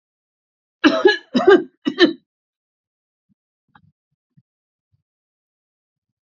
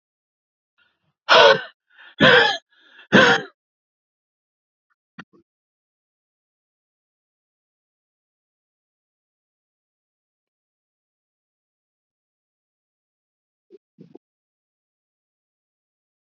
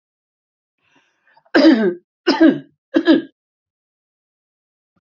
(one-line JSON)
{"cough_length": "6.3 s", "cough_amplitude": 28348, "cough_signal_mean_std_ratio": 0.25, "exhalation_length": "16.3 s", "exhalation_amplitude": 28982, "exhalation_signal_mean_std_ratio": 0.19, "three_cough_length": "5.0 s", "three_cough_amplitude": 27905, "three_cough_signal_mean_std_ratio": 0.34, "survey_phase": "alpha (2021-03-01 to 2021-08-12)", "age": "65+", "gender": "Male", "wearing_mask": "No", "symptom_cough_any": true, "symptom_shortness_of_breath": true, "smoker_status": "Never smoked", "respiratory_condition_asthma": false, "respiratory_condition_other": true, "recruitment_source": "REACT", "submission_delay": "2 days", "covid_test_result": "Negative", "covid_test_method": "RT-qPCR"}